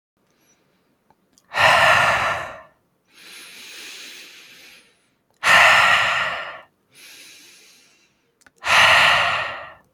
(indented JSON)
{
  "exhalation_length": "9.9 s",
  "exhalation_amplitude": 28157,
  "exhalation_signal_mean_std_ratio": 0.45,
  "survey_phase": "alpha (2021-03-01 to 2021-08-12)",
  "age": "18-44",
  "gender": "Male",
  "wearing_mask": "No",
  "symptom_fatigue": true,
  "symptom_onset": "12 days",
  "smoker_status": "Ex-smoker",
  "respiratory_condition_asthma": false,
  "respiratory_condition_other": false,
  "recruitment_source": "REACT",
  "submission_delay": "3 days",
  "covid_test_result": "Negative",
  "covid_test_method": "RT-qPCR"
}